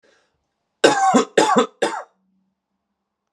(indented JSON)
{
  "three_cough_length": "3.3 s",
  "three_cough_amplitude": 32437,
  "three_cough_signal_mean_std_ratio": 0.4,
  "survey_phase": "beta (2021-08-13 to 2022-03-07)",
  "age": "18-44",
  "gender": "Male",
  "wearing_mask": "No",
  "symptom_diarrhoea": true,
  "symptom_onset": "4 days",
  "smoker_status": "Ex-smoker",
  "respiratory_condition_asthma": false,
  "respiratory_condition_other": false,
  "recruitment_source": "Test and Trace",
  "submission_delay": "2 days",
  "covid_test_result": "Positive",
  "covid_test_method": "RT-qPCR",
  "covid_ct_value": 25.4,
  "covid_ct_gene": "N gene"
}